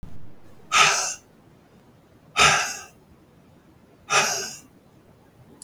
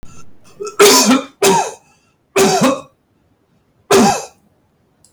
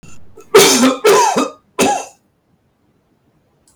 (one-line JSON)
{"exhalation_length": "5.6 s", "exhalation_amplitude": 23490, "exhalation_signal_mean_std_ratio": 0.4, "three_cough_length": "5.1 s", "three_cough_amplitude": 32768, "three_cough_signal_mean_std_ratio": 0.5, "cough_length": "3.8 s", "cough_amplitude": 32768, "cough_signal_mean_std_ratio": 0.5, "survey_phase": "beta (2021-08-13 to 2022-03-07)", "age": "65+", "gender": "Male", "wearing_mask": "No", "symptom_none": true, "smoker_status": "Never smoked", "respiratory_condition_asthma": false, "respiratory_condition_other": false, "recruitment_source": "REACT", "submission_delay": "2 days", "covid_test_result": "Negative", "covid_test_method": "RT-qPCR", "influenza_a_test_result": "Negative", "influenza_b_test_result": "Negative"}